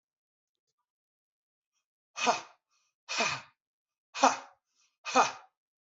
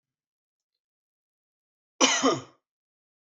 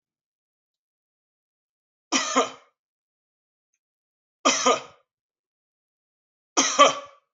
{"exhalation_length": "5.9 s", "exhalation_amplitude": 13161, "exhalation_signal_mean_std_ratio": 0.27, "cough_length": "3.3 s", "cough_amplitude": 16588, "cough_signal_mean_std_ratio": 0.25, "three_cough_length": "7.3 s", "three_cough_amplitude": 27466, "three_cough_signal_mean_std_ratio": 0.26, "survey_phase": "beta (2021-08-13 to 2022-03-07)", "age": "45-64", "gender": "Male", "wearing_mask": "No", "symptom_none": true, "smoker_status": "Current smoker (e-cigarettes or vapes only)", "respiratory_condition_asthma": false, "respiratory_condition_other": false, "recruitment_source": "REACT", "submission_delay": "1 day", "covid_test_result": "Negative", "covid_test_method": "RT-qPCR"}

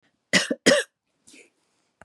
{"three_cough_length": "2.0 s", "three_cough_amplitude": 22551, "three_cough_signal_mean_std_ratio": 0.31, "survey_phase": "beta (2021-08-13 to 2022-03-07)", "age": "65+", "gender": "Female", "wearing_mask": "No", "symptom_cough_any": true, "symptom_onset": "6 days", "smoker_status": "Never smoked", "respiratory_condition_asthma": false, "respiratory_condition_other": false, "recruitment_source": "Test and Trace", "submission_delay": "1 day", "covid_test_result": "Positive", "covid_test_method": "RT-qPCR", "covid_ct_value": 29.1, "covid_ct_gene": "N gene"}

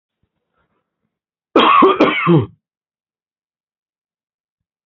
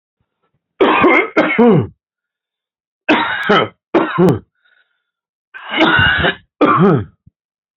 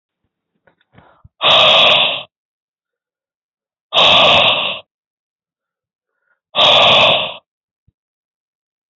{"cough_length": "4.9 s", "cough_amplitude": 32767, "cough_signal_mean_std_ratio": 0.34, "three_cough_length": "7.8 s", "three_cough_amplitude": 32685, "three_cough_signal_mean_std_ratio": 0.53, "exhalation_length": "9.0 s", "exhalation_amplitude": 30841, "exhalation_signal_mean_std_ratio": 0.43, "survey_phase": "beta (2021-08-13 to 2022-03-07)", "age": "45-64", "gender": "Male", "wearing_mask": "No", "symptom_cough_any": true, "symptom_fatigue": true, "smoker_status": "Current smoker (11 or more cigarettes per day)", "respiratory_condition_asthma": false, "respiratory_condition_other": false, "recruitment_source": "REACT", "submission_delay": "1 day", "covid_test_result": "Negative", "covid_test_method": "RT-qPCR"}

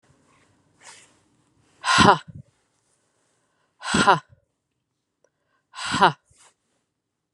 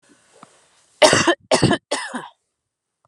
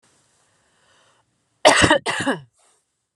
{"exhalation_length": "7.3 s", "exhalation_amplitude": 31747, "exhalation_signal_mean_std_ratio": 0.25, "three_cough_length": "3.1 s", "three_cough_amplitude": 32768, "three_cough_signal_mean_std_ratio": 0.36, "cough_length": "3.2 s", "cough_amplitude": 32767, "cough_signal_mean_std_ratio": 0.32, "survey_phase": "beta (2021-08-13 to 2022-03-07)", "age": "18-44", "gender": "Female", "wearing_mask": "No", "symptom_none": true, "smoker_status": "Ex-smoker", "respiratory_condition_asthma": false, "respiratory_condition_other": false, "recruitment_source": "REACT", "submission_delay": "-1 day", "covid_test_result": "Negative", "covid_test_method": "RT-qPCR", "influenza_a_test_result": "Negative", "influenza_b_test_result": "Negative"}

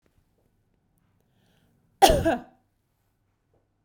{"cough_length": "3.8 s", "cough_amplitude": 25824, "cough_signal_mean_std_ratio": 0.22, "survey_phase": "beta (2021-08-13 to 2022-03-07)", "age": "45-64", "gender": "Female", "wearing_mask": "No", "symptom_none": true, "smoker_status": "Never smoked", "respiratory_condition_asthma": false, "respiratory_condition_other": false, "recruitment_source": "REACT", "submission_delay": "1 day", "covid_test_result": "Negative", "covid_test_method": "RT-qPCR"}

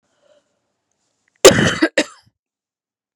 {"cough_length": "3.2 s", "cough_amplitude": 32768, "cough_signal_mean_std_ratio": 0.26, "survey_phase": "beta (2021-08-13 to 2022-03-07)", "age": "18-44", "gender": "Female", "wearing_mask": "No", "symptom_cough_any": true, "symptom_runny_or_blocked_nose": true, "symptom_fever_high_temperature": true, "symptom_onset": "4 days", "smoker_status": "Never smoked", "respiratory_condition_asthma": false, "respiratory_condition_other": false, "recruitment_source": "Test and Trace", "submission_delay": "1 day", "covid_test_result": "Negative", "covid_test_method": "RT-qPCR"}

